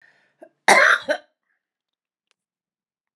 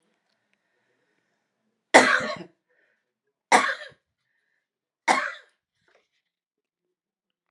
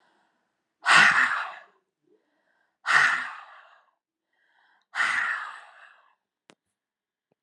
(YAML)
cough_length: 3.2 s
cough_amplitude: 32418
cough_signal_mean_std_ratio: 0.27
three_cough_length: 7.5 s
three_cough_amplitude: 31326
three_cough_signal_mean_std_ratio: 0.22
exhalation_length: 7.4 s
exhalation_amplitude: 19398
exhalation_signal_mean_std_ratio: 0.34
survey_phase: alpha (2021-03-01 to 2021-08-12)
age: 65+
gender: Female
wearing_mask: 'No'
symptom_change_to_sense_of_smell_or_taste: true
symptom_onset: 4 days
smoker_status: Ex-smoker
respiratory_condition_asthma: false
respiratory_condition_other: false
recruitment_source: Test and Trace
submission_delay: 1 day
covid_ct_value: 25.0
covid_ct_gene: ORF1ab gene